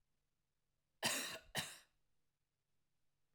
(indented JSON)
{
  "cough_length": "3.3 s",
  "cough_amplitude": 1876,
  "cough_signal_mean_std_ratio": 0.31,
  "survey_phase": "alpha (2021-03-01 to 2021-08-12)",
  "age": "65+",
  "gender": "Female",
  "wearing_mask": "No",
  "symptom_none": true,
  "smoker_status": "Never smoked",
  "respiratory_condition_asthma": false,
  "respiratory_condition_other": false,
  "recruitment_source": "REACT",
  "submission_delay": "1 day",
  "covid_test_result": "Negative",
  "covid_test_method": "RT-qPCR"
}